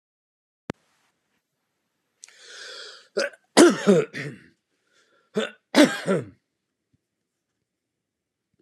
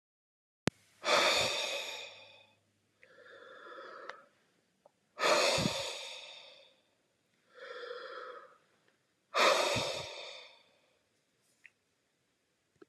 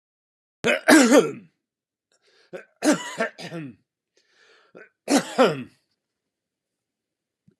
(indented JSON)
{
  "cough_length": "8.6 s",
  "cough_amplitude": 29897,
  "cough_signal_mean_std_ratio": 0.26,
  "exhalation_length": "12.9 s",
  "exhalation_amplitude": 10595,
  "exhalation_signal_mean_std_ratio": 0.39,
  "three_cough_length": "7.6 s",
  "three_cough_amplitude": 30992,
  "three_cough_signal_mean_std_ratio": 0.31,
  "survey_phase": "beta (2021-08-13 to 2022-03-07)",
  "age": "65+",
  "gender": "Male",
  "wearing_mask": "No",
  "symptom_none": true,
  "smoker_status": "Ex-smoker",
  "respiratory_condition_asthma": false,
  "respiratory_condition_other": false,
  "recruitment_source": "REACT",
  "submission_delay": "5 days",
  "covid_test_result": "Negative",
  "covid_test_method": "RT-qPCR",
  "influenza_a_test_result": "Negative",
  "influenza_b_test_result": "Negative"
}